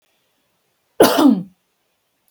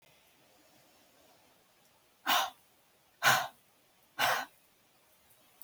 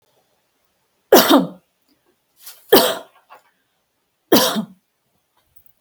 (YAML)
cough_length: 2.3 s
cough_amplitude: 32768
cough_signal_mean_std_ratio: 0.33
exhalation_length: 5.6 s
exhalation_amplitude: 8843
exhalation_signal_mean_std_ratio: 0.3
three_cough_length: 5.8 s
three_cough_amplitude: 32768
three_cough_signal_mean_std_ratio: 0.29
survey_phase: beta (2021-08-13 to 2022-03-07)
age: 18-44
gender: Female
wearing_mask: 'No'
symptom_none: true
smoker_status: Never smoked
respiratory_condition_asthma: false
respiratory_condition_other: false
recruitment_source: REACT
submission_delay: 2 days
covid_test_result: Negative
covid_test_method: RT-qPCR
influenza_a_test_result: Negative
influenza_b_test_result: Negative